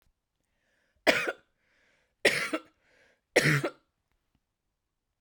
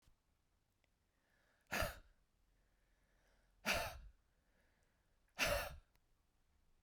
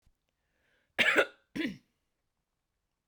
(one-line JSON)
{"three_cough_length": "5.2 s", "three_cough_amplitude": 20114, "three_cough_signal_mean_std_ratio": 0.29, "exhalation_length": "6.8 s", "exhalation_amplitude": 2173, "exhalation_signal_mean_std_ratio": 0.3, "cough_length": "3.1 s", "cough_amplitude": 8669, "cough_signal_mean_std_ratio": 0.28, "survey_phase": "beta (2021-08-13 to 2022-03-07)", "age": "18-44", "gender": "Female", "wearing_mask": "No", "symptom_sore_throat": true, "symptom_fatigue": true, "symptom_headache": true, "symptom_onset": "12 days", "smoker_status": "Ex-smoker", "respiratory_condition_asthma": false, "respiratory_condition_other": false, "recruitment_source": "REACT", "submission_delay": "1 day", "covid_test_result": "Negative", "covid_test_method": "RT-qPCR", "influenza_a_test_result": "Unknown/Void", "influenza_b_test_result": "Unknown/Void"}